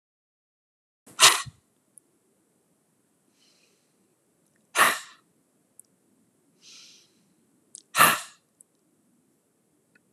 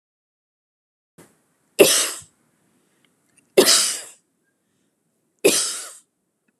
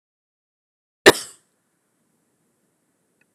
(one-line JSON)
{"exhalation_length": "10.1 s", "exhalation_amplitude": 27540, "exhalation_signal_mean_std_ratio": 0.19, "three_cough_length": "6.6 s", "three_cough_amplitude": 32767, "three_cough_signal_mean_std_ratio": 0.29, "cough_length": "3.3 s", "cough_amplitude": 32768, "cough_signal_mean_std_ratio": 0.11, "survey_phase": "alpha (2021-03-01 to 2021-08-12)", "age": "65+", "gender": "Female", "wearing_mask": "No", "symptom_none": true, "smoker_status": "Ex-smoker", "respiratory_condition_asthma": false, "respiratory_condition_other": false, "recruitment_source": "REACT", "submission_delay": "10 days", "covid_test_result": "Negative", "covid_test_method": "RT-qPCR"}